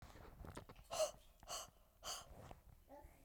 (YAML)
exhalation_length: 3.2 s
exhalation_amplitude: 1152
exhalation_signal_mean_std_ratio: 0.51
survey_phase: beta (2021-08-13 to 2022-03-07)
age: 18-44
gender: Female
wearing_mask: 'No'
symptom_none: true
symptom_onset: 11 days
smoker_status: Never smoked
respiratory_condition_asthma: false
respiratory_condition_other: false
recruitment_source: REACT
submission_delay: 1 day
covid_test_result: Negative
covid_test_method: RT-qPCR